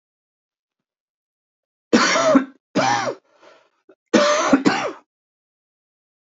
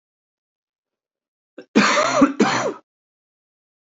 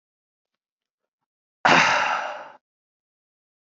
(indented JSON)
{
  "three_cough_length": "6.4 s",
  "three_cough_amplitude": 27520,
  "three_cough_signal_mean_std_ratio": 0.4,
  "cough_length": "3.9 s",
  "cough_amplitude": 27369,
  "cough_signal_mean_std_ratio": 0.37,
  "exhalation_length": "3.8 s",
  "exhalation_amplitude": 23835,
  "exhalation_signal_mean_std_ratio": 0.32,
  "survey_phase": "alpha (2021-03-01 to 2021-08-12)",
  "age": "18-44",
  "gender": "Male",
  "wearing_mask": "Yes",
  "symptom_cough_any": true,
  "symptom_fatigue": true,
  "symptom_onset": "3 days",
  "smoker_status": "Ex-smoker",
  "respiratory_condition_asthma": false,
  "respiratory_condition_other": false,
  "recruitment_source": "Test and Trace",
  "submission_delay": "2 days",
  "covid_test_result": "Positive",
  "covid_test_method": "RT-qPCR",
  "covid_ct_value": 18.2,
  "covid_ct_gene": "ORF1ab gene",
  "covid_ct_mean": 18.2,
  "covid_viral_load": "1000000 copies/ml",
  "covid_viral_load_category": "High viral load (>1M copies/ml)"
}